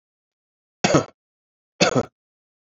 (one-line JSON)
{"cough_length": "2.6 s", "cough_amplitude": 25483, "cough_signal_mean_std_ratio": 0.28, "survey_phase": "beta (2021-08-13 to 2022-03-07)", "age": "18-44", "gender": "Male", "wearing_mask": "No", "symptom_runny_or_blocked_nose": true, "symptom_sore_throat": true, "symptom_fatigue": true, "symptom_headache": true, "symptom_other": true, "symptom_onset": "3 days", "smoker_status": "Never smoked", "respiratory_condition_asthma": false, "respiratory_condition_other": false, "recruitment_source": "Test and Trace", "submission_delay": "2 days", "covid_test_result": "Positive", "covid_test_method": "RT-qPCR", "covid_ct_value": 29.3, "covid_ct_gene": "N gene"}